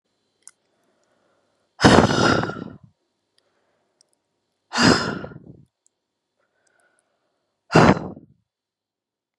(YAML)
exhalation_length: 9.4 s
exhalation_amplitude: 32768
exhalation_signal_mean_std_ratio: 0.28
survey_phase: beta (2021-08-13 to 2022-03-07)
age: 18-44
gender: Female
wearing_mask: 'No'
symptom_runny_or_blocked_nose: true
symptom_sore_throat: true
symptom_fatigue: true
symptom_headache: true
smoker_status: Never smoked
respiratory_condition_asthma: false
respiratory_condition_other: false
recruitment_source: REACT
submission_delay: 1 day
covid_test_result: Negative
covid_test_method: RT-qPCR
influenza_a_test_result: Negative
influenza_b_test_result: Negative